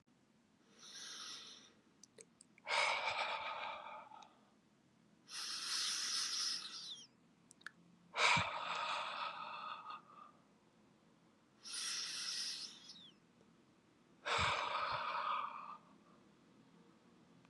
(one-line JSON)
{"exhalation_length": "17.5 s", "exhalation_amplitude": 4299, "exhalation_signal_mean_std_ratio": 0.56, "survey_phase": "beta (2021-08-13 to 2022-03-07)", "age": "18-44", "gender": "Male", "wearing_mask": "No", "symptom_cough_any": true, "symptom_headache": true, "symptom_onset": "9 days", "smoker_status": "Never smoked", "respiratory_condition_asthma": false, "respiratory_condition_other": false, "recruitment_source": "Test and Trace", "submission_delay": "6 days", "covid_test_result": "Negative", "covid_test_method": "ePCR"}